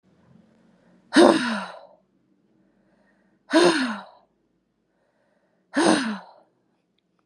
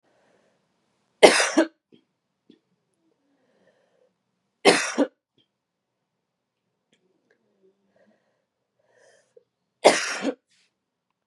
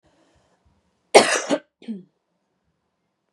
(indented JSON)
{
  "exhalation_length": "7.3 s",
  "exhalation_amplitude": 32536,
  "exhalation_signal_mean_std_ratio": 0.32,
  "three_cough_length": "11.3 s",
  "three_cough_amplitude": 32767,
  "three_cough_signal_mean_std_ratio": 0.21,
  "cough_length": "3.3 s",
  "cough_amplitude": 32768,
  "cough_signal_mean_std_ratio": 0.23,
  "survey_phase": "beta (2021-08-13 to 2022-03-07)",
  "age": "18-44",
  "gender": "Female",
  "wearing_mask": "Yes",
  "symptom_cough_any": true,
  "symptom_runny_or_blocked_nose": true,
  "symptom_shortness_of_breath": true,
  "symptom_fatigue": true,
  "symptom_headache": true,
  "smoker_status": "Never smoked",
  "respiratory_condition_asthma": false,
  "respiratory_condition_other": false,
  "recruitment_source": "Test and Trace",
  "submission_delay": "-1 day",
  "covid_test_result": "Positive",
  "covid_test_method": "LFT"
}